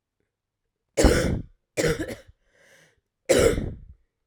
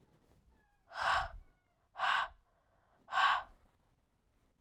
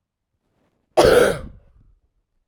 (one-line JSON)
{"three_cough_length": "4.3 s", "three_cough_amplitude": 24711, "three_cough_signal_mean_std_ratio": 0.4, "exhalation_length": "4.6 s", "exhalation_amplitude": 4112, "exhalation_signal_mean_std_ratio": 0.38, "cough_length": "2.5 s", "cough_amplitude": 31937, "cough_signal_mean_std_ratio": 0.33, "survey_phase": "beta (2021-08-13 to 2022-03-07)", "age": "18-44", "gender": "Female", "wearing_mask": "No", "symptom_cough_any": true, "symptom_runny_or_blocked_nose": true, "symptom_sore_throat": true, "symptom_fatigue": true, "symptom_headache": true, "symptom_onset": "7 days", "smoker_status": "Never smoked", "respiratory_condition_asthma": false, "respiratory_condition_other": false, "recruitment_source": "Test and Trace", "submission_delay": "1 day", "covid_test_result": "Positive", "covid_test_method": "RT-qPCR", "covid_ct_value": 11.6, "covid_ct_gene": "ORF1ab gene", "covid_ct_mean": 12.2, "covid_viral_load": "100000000 copies/ml", "covid_viral_load_category": "High viral load (>1M copies/ml)"}